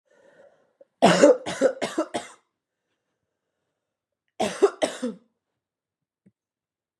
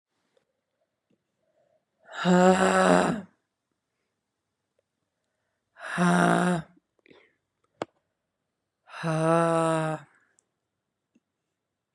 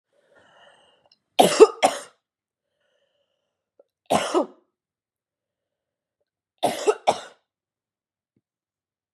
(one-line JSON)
{"cough_length": "7.0 s", "cough_amplitude": 26074, "cough_signal_mean_std_ratio": 0.29, "exhalation_length": "11.9 s", "exhalation_amplitude": 19170, "exhalation_signal_mean_std_ratio": 0.36, "three_cough_length": "9.1 s", "three_cough_amplitude": 32157, "three_cough_signal_mean_std_ratio": 0.22, "survey_phase": "beta (2021-08-13 to 2022-03-07)", "age": "18-44", "gender": "Female", "wearing_mask": "No", "symptom_cough_any": true, "symptom_new_continuous_cough": true, "symptom_runny_or_blocked_nose": true, "symptom_shortness_of_breath": true, "symptom_sore_throat": true, "symptom_fatigue": true, "symptom_fever_high_temperature": true, "symptom_headache": true, "symptom_onset": "5 days", "smoker_status": "Ex-smoker", "respiratory_condition_asthma": false, "respiratory_condition_other": false, "recruitment_source": "Test and Trace", "submission_delay": "2 days", "covid_test_result": "Positive", "covid_test_method": "RT-qPCR", "covid_ct_value": 30.8, "covid_ct_gene": "N gene"}